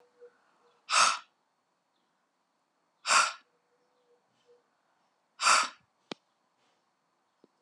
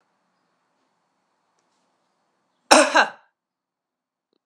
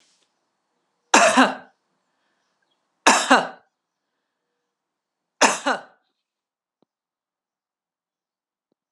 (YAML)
exhalation_length: 7.6 s
exhalation_amplitude: 10654
exhalation_signal_mean_std_ratio: 0.25
cough_length: 4.5 s
cough_amplitude: 32768
cough_signal_mean_std_ratio: 0.2
three_cough_length: 8.9 s
three_cough_amplitude: 32768
three_cough_signal_mean_std_ratio: 0.25
survey_phase: alpha (2021-03-01 to 2021-08-12)
age: 65+
gender: Female
wearing_mask: 'No'
symptom_none: true
smoker_status: Never smoked
respiratory_condition_asthma: false
respiratory_condition_other: false
recruitment_source: REACT
submission_delay: 2 days
covid_test_result: Negative
covid_test_method: RT-qPCR